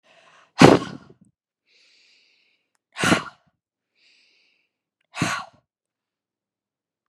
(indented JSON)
{
  "exhalation_length": "7.1 s",
  "exhalation_amplitude": 32768,
  "exhalation_signal_mean_std_ratio": 0.2,
  "survey_phase": "beta (2021-08-13 to 2022-03-07)",
  "age": "18-44",
  "gender": "Female",
  "wearing_mask": "No",
  "symptom_none": true,
  "symptom_onset": "13 days",
  "smoker_status": "Never smoked",
  "respiratory_condition_asthma": false,
  "respiratory_condition_other": false,
  "recruitment_source": "REACT",
  "submission_delay": "3 days",
  "covid_test_result": "Negative",
  "covid_test_method": "RT-qPCR",
  "influenza_a_test_result": "Negative",
  "influenza_b_test_result": "Negative"
}